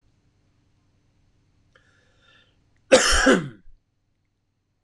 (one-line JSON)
{"cough_length": "4.8 s", "cough_amplitude": 25004, "cough_signal_mean_std_ratio": 0.26, "survey_phase": "beta (2021-08-13 to 2022-03-07)", "age": "45-64", "gender": "Male", "wearing_mask": "No", "symptom_cough_any": true, "symptom_onset": "6 days", "smoker_status": "Never smoked", "respiratory_condition_asthma": true, "respiratory_condition_other": false, "recruitment_source": "REACT", "submission_delay": "1 day", "covid_test_result": "Negative", "covid_test_method": "RT-qPCR", "influenza_a_test_result": "Unknown/Void", "influenza_b_test_result": "Unknown/Void"}